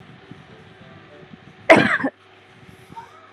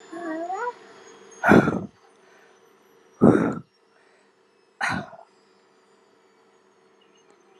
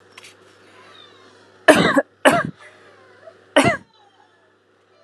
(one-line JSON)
{"cough_length": "3.3 s", "cough_amplitude": 32768, "cough_signal_mean_std_ratio": 0.28, "exhalation_length": "7.6 s", "exhalation_amplitude": 28075, "exhalation_signal_mean_std_ratio": 0.3, "three_cough_length": "5.0 s", "three_cough_amplitude": 32768, "three_cough_signal_mean_std_ratio": 0.3, "survey_phase": "beta (2021-08-13 to 2022-03-07)", "age": "18-44", "gender": "Female", "wearing_mask": "Yes", "symptom_abdominal_pain": true, "symptom_fever_high_temperature": true, "symptom_headache": true, "symptom_onset": "2 days", "smoker_status": "Never smoked", "respiratory_condition_asthma": false, "respiratory_condition_other": false, "recruitment_source": "Test and Trace", "submission_delay": "1 day", "covid_test_result": "Positive", "covid_test_method": "RT-qPCR"}